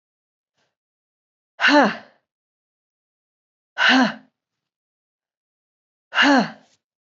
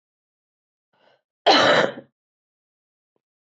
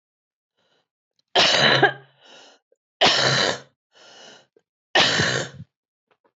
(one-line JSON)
{"exhalation_length": "7.1 s", "exhalation_amplitude": 19809, "exhalation_signal_mean_std_ratio": 0.31, "cough_length": "3.5 s", "cough_amplitude": 19727, "cough_signal_mean_std_ratio": 0.28, "three_cough_length": "6.4 s", "three_cough_amplitude": 21529, "three_cough_signal_mean_std_ratio": 0.42, "survey_phase": "beta (2021-08-13 to 2022-03-07)", "age": "18-44", "gender": "Female", "wearing_mask": "No", "symptom_cough_any": true, "symptom_runny_or_blocked_nose": true, "symptom_shortness_of_breath": true, "symptom_sore_throat": true, "symptom_fatigue": true, "symptom_headache": true, "symptom_change_to_sense_of_smell_or_taste": true, "smoker_status": "Never smoked", "respiratory_condition_asthma": false, "respiratory_condition_other": false, "recruitment_source": "Test and Trace", "submission_delay": "2 days", "covid_test_result": "Positive", "covid_test_method": "RT-qPCR", "covid_ct_value": 23.3, "covid_ct_gene": "ORF1ab gene", "covid_ct_mean": 24.2, "covid_viral_load": "12000 copies/ml", "covid_viral_load_category": "Low viral load (10K-1M copies/ml)"}